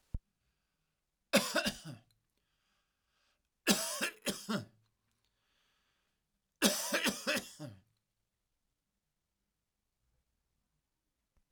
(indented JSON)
{
  "three_cough_length": "11.5 s",
  "three_cough_amplitude": 8384,
  "three_cough_signal_mean_std_ratio": 0.29,
  "survey_phase": "alpha (2021-03-01 to 2021-08-12)",
  "age": "45-64",
  "gender": "Male",
  "wearing_mask": "No",
  "symptom_none": true,
  "smoker_status": "Ex-smoker",
  "respiratory_condition_asthma": false,
  "respiratory_condition_other": false,
  "recruitment_source": "REACT",
  "submission_delay": "2 days",
  "covid_test_result": "Negative",
  "covid_test_method": "RT-qPCR"
}